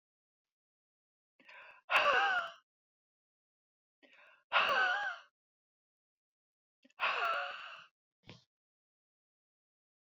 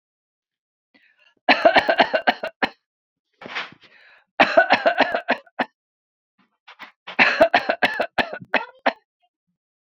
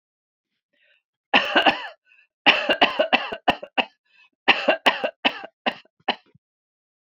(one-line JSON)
{"exhalation_length": "10.2 s", "exhalation_amplitude": 5175, "exhalation_signal_mean_std_ratio": 0.34, "three_cough_length": "9.8 s", "three_cough_amplitude": 27590, "three_cough_signal_mean_std_ratio": 0.36, "cough_length": "7.1 s", "cough_amplitude": 28929, "cough_signal_mean_std_ratio": 0.36, "survey_phase": "beta (2021-08-13 to 2022-03-07)", "age": "45-64", "gender": "Female", "wearing_mask": "No", "symptom_none": true, "smoker_status": "Never smoked", "respiratory_condition_asthma": false, "respiratory_condition_other": false, "recruitment_source": "REACT", "submission_delay": "1 day", "covid_test_result": "Negative", "covid_test_method": "RT-qPCR"}